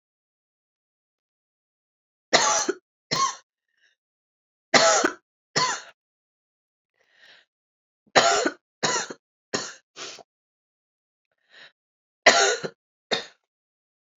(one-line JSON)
{"cough_length": "14.2 s", "cough_amplitude": 29516, "cough_signal_mean_std_ratio": 0.3, "survey_phase": "beta (2021-08-13 to 2022-03-07)", "age": "45-64", "gender": "Female", "wearing_mask": "No", "symptom_cough_any": true, "symptom_runny_or_blocked_nose": true, "symptom_sore_throat": true, "symptom_fatigue": true, "symptom_other": true, "symptom_onset": "3 days", "smoker_status": "Never smoked", "respiratory_condition_asthma": false, "respiratory_condition_other": false, "recruitment_source": "Test and Trace", "submission_delay": "2 days", "covid_test_result": "Positive", "covid_test_method": "RT-qPCR", "covid_ct_value": 15.7, "covid_ct_gene": "ORF1ab gene", "covid_ct_mean": 16.0, "covid_viral_load": "5600000 copies/ml", "covid_viral_load_category": "High viral load (>1M copies/ml)"}